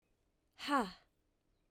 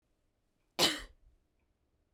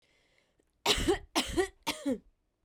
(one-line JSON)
{"exhalation_length": "1.7 s", "exhalation_amplitude": 3106, "exhalation_signal_mean_std_ratio": 0.29, "cough_length": "2.1 s", "cough_amplitude": 6978, "cough_signal_mean_std_ratio": 0.24, "three_cough_length": "2.6 s", "three_cough_amplitude": 7534, "three_cough_signal_mean_std_ratio": 0.45, "survey_phase": "beta (2021-08-13 to 2022-03-07)", "age": "18-44", "gender": "Female", "wearing_mask": "No", "symptom_runny_or_blocked_nose": true, "symptom_sore_throat": true, "symptom_onset": "2 days", "smoker_status": "Never smoked", "respiratory_condition_asthma": false, "respiratory_condition_other": false, "recruitment_source": "Test and Trace", "submission_delay": "1 day", "covid_test_result": "Positive", "covid_test_method": "RT-qPCR", "covid_ct_value": 28.6, "covid_ct_gene": "ORF1ab gene", "covid_ct_mean": 29.3, "covid_viral_load": "240 copies/ml", "covid_viral_load_category": "Minimal viral load (< 10K copies/ml)"}